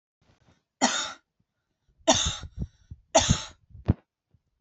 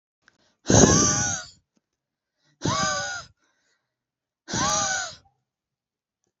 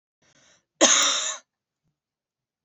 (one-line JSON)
{"three_cough_length": "4.6 s", "three_cough_amplitude": 16751, "three_cough_signal_mean_std_ratio": 0.33, "exhalation_length": "6.4 s", "exhalation_amplitude": 27635, "exhalation_signal_mean_std_ratio": 0.39, "cough_length": "2.6 s", "cough_amplitude": 28747, "cough_signal_mean_std_ratio": 0.33, "survey_phase": "beta (2021-08-13 to 2022-03-07)", "age": "18-44", "gender": "Female", "wearing_mask": "No", "symptom_diarrhoea": true, "symptom_onset": "4 days", "smoker_status": "Never smoked", "respiratory_condition_asthma": true, "respiratory_condition_other": false, "recruitment_source": "Test and Trace", "submission_delay": "0 days", "covid_test_result": "Positive", "covid_test_method": "ePCR"}